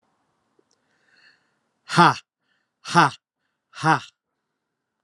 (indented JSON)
{
  "exhalation_length": "5.0 s",
  "exhalation_amplitude": 31100,
  "exhalation_signal_mean_std_ratio": 0.24,
  "survey_phase": "alpha (2021-03-01 to 2021-08-12)",
  "age": "45-64",
  "gender": "Male",
  "wearing_mask": "No",
  "symptom_cough_any": true,
  "symptom_fatigue": true,
  "symptom_headache": true,
  "smoker_status": "Never smoked",
  "respiratory_condition_asthma": false,
  "respiratory_condition_other": false,
  "recruitment_source": "Test and Trace",
  "submission_delay": "2 days",
  "covid_test_result": "Positive",
  "covid_test_method": "LFT"
}